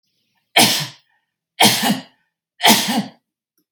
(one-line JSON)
{"three_cough_length": "3.7 s", "three_cough_amplitude": 32768, "three_cough_signal_mean_std_ratio": 0.41, "survey_phase": "beta (2021-08-13 to 2022-03-07)", "age": "45-64", "gender": "Female", "wearing_mask": "No", "symptom_none": true, "smoker_status": "Never smoked", "respiratory_condition_asthma": false, "respiratory_condition_other": false, "recruitment_source": "REACT", "submission_delay": "8 days", "covid_test_result": "Negative", "covid_test_method": "RT-qPCR", "influenza_a_test_result": "Negative", "influenza_b_test_result": "Negative"}